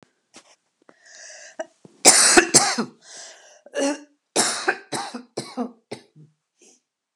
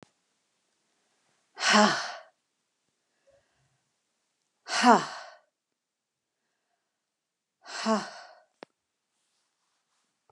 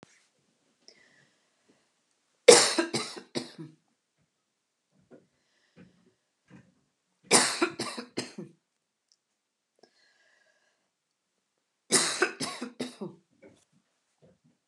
cough_length: 7.2 s
cough_amplitude: 32768
cough_signal_mean_std_ratio: 0.34
exhalation_length: 10.3 s
exhalation_amplitude: 19164
exhalation_signal_mean_std_ratio: 0.23
three_cough_length: 14.7 s
three_cough_amplitude: 31352
three_cough_signal_mean_std_ratio: 0.22
survey_phase: beta (2021-08-13 to 2022-03-07)
age: 45-64
gender: Female
wearing_mask: 'No'
symptom_none: true
smoker_status: Never smoked
respiratory_condition_asthma: false
respiratory_condition_other: false
recruitment_source: REACT
submission_delay: 2 days
covid_test_result: Negative
covid_test_method: RT-qPCR
influenza_a_test_result: Negative
influenza_b_test_result: Negative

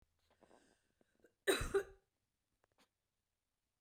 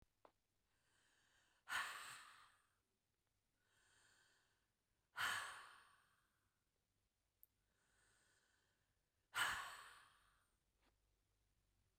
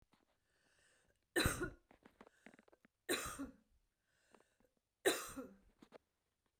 cough_length: 3.8 s
cough_amplitude: 2751
cough_signal_mean_std_ratio: 0.23
exhalation_length: 12.0 s
exhalation_amplitude: 1167
exhalation_signal_mean_std_ratio: 0.29
three_cough_length: 6.6 s
three_cough_amplitude: 2879
three_cough_signal_mean_std_ratio: 0.29
survey_phase: beta (2021-08-13 to 2022-03-07)
age: 65+
gender: Female
wearing_mask: 'No'
symptom_none: true
smoker_status: Ex-smoker
respiratory_condition_asthma: false
respiratory_condition_other: false
recruitment_source: REACT
submission_delay: 1 day
covid_test_result: Negative
covid_test_method: RT-qPCR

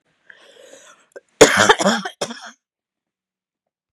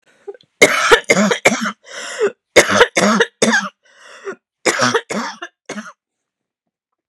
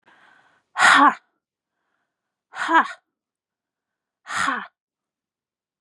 cough_length: 3.9 s
cough_amplitude: 32768
cough_signal_mean_std_ratio: 0.28
three_cough_length: 7.1 s
three_cough_amplitude: 32768
three_cough_signal_mean_std_ratio: 0.46
exhalation_length: 5.8 s
exhalation_amplitude: 27316
exhalation_signal_mean_std_ratio: 0.29
survey_phase: beta (2021-08-13 to 2022-03-07)
age: 45-64
gender: Female
wearing_mask: 'No'
symptom_none: true
smoker_status: Never smoked
respiratory_condition_asthma: false
respiratory_condition_other: false
recruitment_source: REACT
submission_delay: 1 day
covid_test_result: Negative
covid_test_method: RT-qPCR
influenza_a_test_result: Negative
influenza_b_test_result: Negative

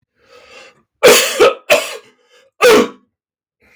three_cough_length: 3.8 s
three_cough_amplitude: 32768
three_cough_signal_mean_std_ratio: 0.43
survey_phase: beta (2021-08-13 to 2022-03-07)
age: 45-64
gender: Male
wearing_mask: 'No'
symptom_none: true
smoker_status: Never smoked
respiratory_condition_asthma: false
respiratory_condition_other: false
recruitment_source: REACT
submission_delay: 3 days
covid_test_result: Negative
covid_test_method: RT-qPCR
influenza_a_test_result: Negative
influenza_b_test_result: Negative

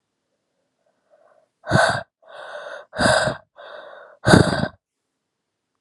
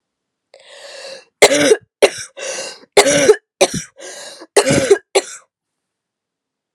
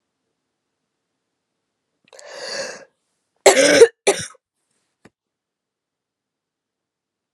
exhalation_length: 5.8 s
exhalation_amplitude: 32767
exhalation_signal_mean_std_ratio: 0.35
three_cough_length: 6.7 s
three_cough_amplitude: 32768
three_cough_signal_mean_std_ratio: 0.39
cough_length: 7.3 s
cough_amplitude: 32768
cough_signal_mean_std_ratio: 0.22
survey_phase: beta (2021-08-13 to 2022-03-07)
age: 18-44
gender: Female
wearing_mask: 'No'
symptom_cough_any: true
symptom_runny_or_blocked_nose: true
symptom_shortness_of_breath: true
symptom_sore_throat: true
symptom_headache: true
symptom_onset: 3 days
smoker_status: Ex-smoker
respiratory_condition_asthma: false
respiratory_condition_other: false
recruitment_source: Test and Trace
submission_delay: 1 day
covid_test_result: Positive
covid_test_method: RT-qPCR
covid_ct_value: 24.2
covid_ct_gene: ORF1ab gene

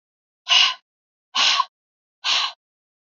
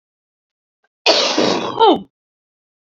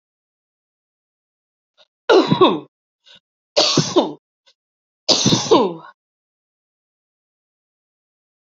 exhalation_length: 3.2 s
exhalation_amplitude: 23334
exhalation_signal_mean_std_ratio: 0.4
cough_length: 2.8 s
cough_amplitude: 30734
cough_signal_mean_std_ratio: 0.43
three_cough_length: 8.5 s
three_cough_amplitude: 31851
three_cough_signal_mean_std_ratio: 0.32
survey_phase: beta (2021-08-13 to 2022-03-07)
age: 45-64
gender: Female
wearing_mask: 'No'
symptom_cough_any: true
symptom_runny_or_blocked_nose: true
symptom_headache: true
symptom_onset: 4 days
smoker_status: Ex-smoker
respiratory_condition_asthma: true
respiratory_condition_other: false
recruitment_source: REACT
submission_delay: 1 day
covid_test_result: Negative
covid_test_method: RT-qPCR
influenza_a_test_result: Negative
influenza_b_test_result: Negative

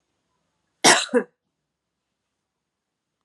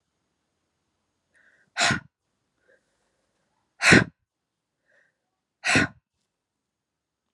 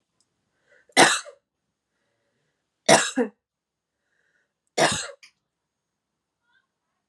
cough_length: 3.2 s
cough_amplitude: 29977
cough_signal_mean_std_ratio: 0.22
exhalation_length: 7.3 s
exhalation_amplitude: 28177
exhalation_signal_mean_std_ratio: 0.21
three_cough_length: 7.1 s
three_cough_amplitude: 28256
three_cough_signal_mean_std_ratio: 0.24
survey_phase: alpha (2021-03-01 to 2021-08-12)
age: 18-44
gender: Female
wearing_mask: 'No'
symptom_fatigue: true
symptom_headache: true
smoker_status: Never smoked
respiratory_condition_asthma: false
respiratory_condition_other: false
recruitment_source: Test and Trace
submission_delay: 1 day
covid_ct_value: 24.3
covid_ct_gene: ORF1ab gene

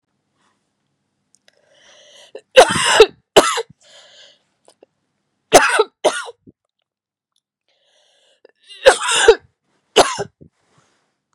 three_cough_length: 11.3 s
three_cough_amplitude: 32768
three_cough_signal_mean_std_ratio: 0.28
survey_phase: beta (2021-08-13 to 2022-03-07)
age: 45-64
gender: Female
wearing_mask: 'No'
symptom_cough_any: true
symptom_sore_throat: true
symptom_fatigue: true
symptom_headache: true
symptom_change_to_sense_of_smell_or_taste: true
symptom_onset: 3 days
smoker_status: Ex-smoker
respiratory_condition_asthma: false
respiratory_condition_other: false
recruitment_source: Test and Trace
submission_delay: 1 day
covid_test_result: Positive
covid_test_method: RT-qPCR
covid_ct_value: 15.8
covid_ct_gene: ORF1ab gene
covid_ct_mean: 16.1
covid_viral_load: 5300000 copies/ml
covid_viral_load_category: High viral load (>1M copies/ml)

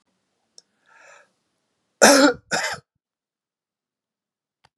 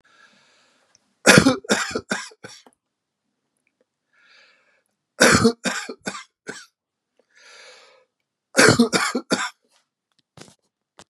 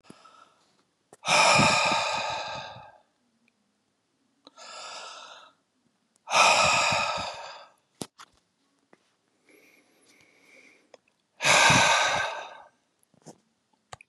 cough_length: 4.8 s
cough_amplitude: 32767
cough_signal_mean_std_ratio: 0.24
three_cough_length: 11.1 s
three_cough_amplitude: 32768
three_cough_signal_mean_std_ratio: 0.3
exhalation_length: 14.1 s
exhalation_amplitude: 15857
exhalation_signal_mean_std_ratio: 0.4
survey_phase: beta (2021-08-13 to 2022-03-07)
age: 65+
gender: Male
wearing_mask: 'No'
symptom_none: true
smoker_status: Never smoked
respiratory_condition_asthma: false
respiratory_condition_other: false
recruitment_source: REACT
submission_delay: 1 day
covid_test_result: Negative
covid_test_method: RT-qPCR
influenza_a_test_result: Negative
influenza_b_test_result: Negative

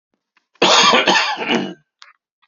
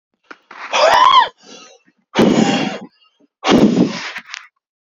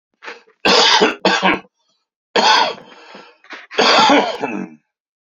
cough_length: 2.5 s
cough_amplitude: 32768
cough_signal_mean_std_ratio: 0.53
exhalation_length: 4.9 s
exhalation_amplitude: 32655
exhalation_signal_mean_std_ratio: 0.51
three_cough_length: 5.4 s
three_cough_amplitude: 32768
three_cough_signal_mean_std_ratio: 0.52
survey_phase: beta (2021-08-13 to 2022-03-07)
age: 45-64
gender: Male
wearing_mask: 'No'
symptom_cough_any: true
symptom_sore_throat: true
symptom_diarrhoea: true
symptom_fatigue: true
symptom_headache: true
symptom_onset: 5 days
smoker_status: Current smoker (1 to 10 cigarettes per day)
respiratory_condition_asthma: false
respiratory_condition_other: false
recruitment_source: Test and Trace
submission_delay: 3 days
covid_test_result: Positive
covid_test_method: RT-qPCR
covid_ct_value: 25.3
covid_ct_gene: ORF1ab gene
covid_ct_mean: 25.7
covid_viral_load: 3800 copies/ml
covid_viral_load_category: Minimal viral load (< 10K copies/ml)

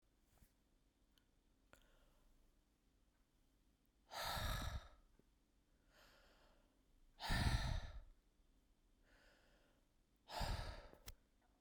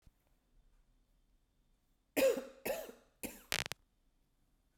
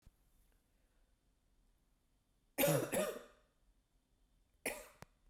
exhalation_length: 11.6 s
exhalation_amplitude: 1659
exhalation_signal_mean_std_ratio: 0.36
cough_length: 4.8 s
cough_amplitude: 11273
cough_signal_mean_std_ratio: 0.27
three_cough_length: 5.3 s
three_cough_amplitude: 3051
three_cough_signal_mean_std_ratio: 0.3
survey_phase: beta (2021-08-13 to 2022-03-07)
age: 18-44
gender: Female
wearing_mask: 'No'
symptom_cough_any: true
symptom_sore_throat: true
symptom_onset: 6 days
smoker_status: Ex-smoker
respiratory_condition_asthma: false
respiratory_condition_other: false
recruitment_source: Test and Trace
submission_delay: 2 days
covid_test_result: Positive
covid_test_method: LAMP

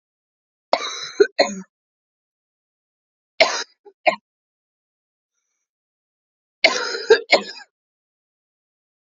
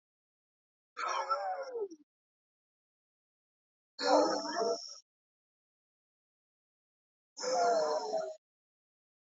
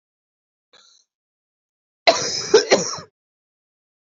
three_cough_length: 9.0 s
three_cough_amplitude: 30997
three_cough_signal_mean_std_ratio: 0.25
exhalation_length: 9.2 s
exhalation_amplitude: 6141
exhalation_signal_mean_std_ratio: 0.42
cough_length: 4.0 s
cough_amplitude: 28824
cough_signal_mean_std_ratio: 0.28
survey_phase: beta (2021-08-13 to 2022-03-07)
age: 18-44
gender: Female
wearing_mask: 'No'
symptom_cough_any: true
symptom_new_continuous_cough: true
symptom_runny_or_blocked_nose: true
symptom_shortness_of_breath: true
symptom_fatigue: true
symptom_fever_high_temperature: true
symptom_headache: true
symptom_change_to_sense_of_smell_or_taste: true
symptom_loss_of_taste: true
symptom_other: true
symptom_onset: 2 days
smoker_status: Current smoker (1 to 10 cigarettes per day)
respiratory_condition_asthma: true
respiratory_condition_other: false
recruitment_source: Test and Trace
submission_delay: 1 day
covid_test_result: Positive
covid_test_method: RT-qPCR
covid_ct_value: 22.1
covid_ct_gene: ORF1ab gene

